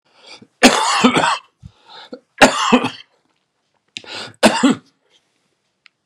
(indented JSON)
{
  "three_cough_length": "6.1 s",
  "three_cough_amplitude": 32768,
  "three_cough_signal_mean_std_ratio": 0.39,
  "survey_phase": "beta (2021-08-13 to 2022-03-07)",
  "age": "65+",
  "gender": "Male",
  "wearing_mask": "No",
  "symptom_cough_any": true,
  "symptom_shortness_of_breath": true,
  "symptom_fatigue": true,
  "symptom_fever_high_temperature": true,
  "symptom_headache": true,
  "symptom_change_to_sense_of_smell_or_taste": true,
  "symptom_loss_of_taste": true,
  "symptom_onset": "4 days",
  "smoker_status": "Never smoked",
  "respiratory_condition_asthma": false,
  "respiratory_condition_other": false,
  "recruitment_source": "Test and Trace",
  "submission_delay": "2 days",
  "covid_test_result": "Positive",
  "covid_test_method": "RT-qPCR"
}